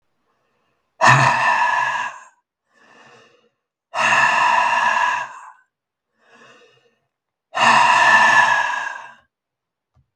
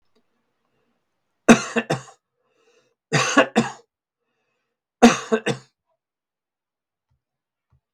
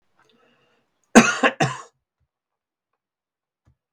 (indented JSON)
{
  "exhalation_length": "10.2 s",
  "exhalation_amplitude": 32766,
  "exhalation_signal_mean_std_ratio": 0.52,
  "three_cough_length": "7.9 s",
  "three_cough_amplitude": 32768,
  "three_cough_signal_mean_std_ratio": 0.24,
  "cough_length": "3.9 s",
  "cough_amplitude": 32768,
  "cough_signal_mean_std_ratio": 0.22,
  "survey_phase": "beta (2021-08-13 to 2022-03-07)",
  "age": "65+",
  "gender": "Male",
  "wearing_mask": "No",
  "symptom_none": true,
  "smoker_status": "Ex-smoker",
  "respiratory_condition_asthma": false,
  "respiratory_condition_other": false,
  "recruitment_source": "REACT",
  "submission_delay": "1 day",
  "covid_test_result": "Negative",
  "covid_test_method": "RT-qPCR"
}